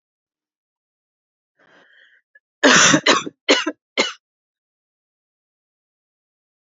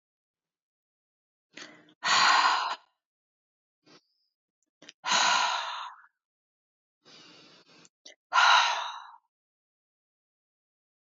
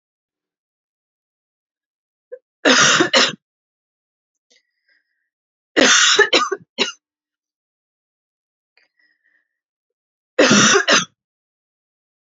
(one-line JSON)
{"cough_length": "6.7 s", "cough_amplitude": 31263, "cough_signal_mean_std_ratio": 0.27, "exhalation_length": "11.1 s", "exhalation_amplitude": 12537, "exhalation_signal_mean_std_ratio": 0.34, "three_cough_length": "12.4 s", "three_cough_amplitude": 32767, "three_cough_signal_mean_std_ratio": 0.32, "survey_phase": "alpha (2021-03-01 to 2021-08-12)", "age": "18-44", "gender": "Female", "wearing_mask": "No", "symptom_cough_any": true, "symptom_change_to_sense_of_smell_or_taste": true, "smoker_status": "Never smoked", "respiratory_condition_asthma": false, "respiratory_condition_other": false, "recruitment_source": "Test and Trace", "submission_delay": "1 day", "covid_test_result": "Positive", "covid_test_method": "RT-qPCR", "covid_ct_value": 21.8, "covid_ct_gene": "N gene", "covid_ct_mean": 22.6, "covid_viral_load": "39000 copies/ml", "covid_viral_load_category": "Low viral load (10K-1M copies/ml)"}